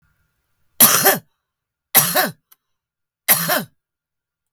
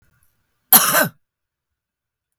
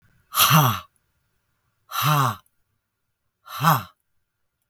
three_cough_length: 4.5 s
three_cough_amplitude: 32768
three_cough_signal_mean_std_ratio: 0.35
cough_length: 2.4 s
cough_amplitude: 32768
cough_signal_mean_std_ratio: 0.27
exhalation_length: 4.7 s
exhalation_amplitude: 24183
exhalation_signal_mean_std_ratio: 0.38
survey_phase: beta (2021-08-13 to 2022-03-07)
age: 45-64
gender: Female
wearing_mask: 'No'
symptom_cough_any: true
symptom_diarrhoea: true
symptom_fatigue: true
symptom_onset: 12 days
smoker_status: Current smoker (11 or more cigarettes per day)
respiratory_condition_asthma: false
respiratory_condition_other: false
recruitment_source: REACT
submission_delay: 1 day
covid_test_result: Negative
covid_test_method: RT-qPCR
influenza_a_test_result: Negative
influenza_b_test_result: Negative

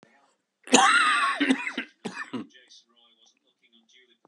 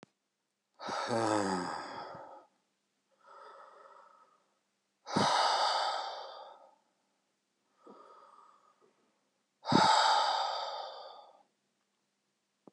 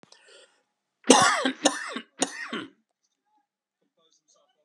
cough_length: 4.3 s
cough_amplitude: 30038
cough_signal_mean_std_ratio: 0.41
exhalation_length: 12.7 s
exhalation_amplitude: 8697
exhalation_signal_mean_std_ratio: 0.43
three_cough_length: 4.6 s
three_cough_amplitude: 32693
three_cough_signal_mean_std_ratio: 0.3
survey_phase: beta (2021-08-13 to 2022-03-07)
age: 45-64
gender: Male
wearing_mask: 'No'
symptom_cough_any: true
symptom_shortness_of_breath: true
symptom_abdominal_pain: true
symptom_fatigue: true
symptom_change_to_sense_of_smell_or_taste: true
symptom_loss_of_taste: true
symptom_onset: 9 days
smoker_status: Never smoked
respiratory_condition_asthma: false
respiratory_condition_other: false
recruitment_source: Test and Trace
submission_delay: 2 days
covid_test_result: Positive
covid_test_method: RT-qPCR
covid_ct_value: 26.4
covid_ct_gene: N gene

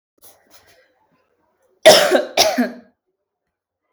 cough_length: 3.9 s
cough_amplitude: 32768
cough_signal_mean_std_ratio: 0.31
survey_phase: beta (2021-08-13 to 2022-03-07)
age: 18-44
gender: Female
wearing_mask: 'No'
symptom_none: true
smoker_status: Never smoked
respiratory_condition_asthma: false
respiratory_condition_other: false
recruitment_source: REACT
submission_delay: 2 days
covid_test_result: Negative
covid_test_method: RT-qPCR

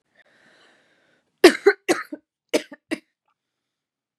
three_cough_length: 4.2 s
three_cough_amplitude: 32767
three_cough_signal_mean_std_ratio: 0.2
survey_phase: beta (2021-08-13 to 2022-03-07)
age: 18-44
gender: Female
wearing_mask: 'No'
symptom_cough_any: true
symptom_runny_or_blocked_nose: true
symptom_sore_throat: true
symptom_diarrhoea: true
symptom_fatigue: true
symptom_headache: true
symptom_loss_of_taste: true
symptom_onset: 5 days
smoker_status: Ex-smoker
respiratory_condition_asthma: false
respiratory_condition_other: false
recruitment_source: Test and Trace
submission_delay: 2 days
covid_test_result: Positive
covid_test_method: RT-qPCR
covid_ct_value: 18.2
covid_ct_gene: ORF1ab gene
covid_ct_mean: 18.4
covid_viral_load: 930000 copies/ml
covid_viral_load_category: Low viral load (10K-1M copies/ml)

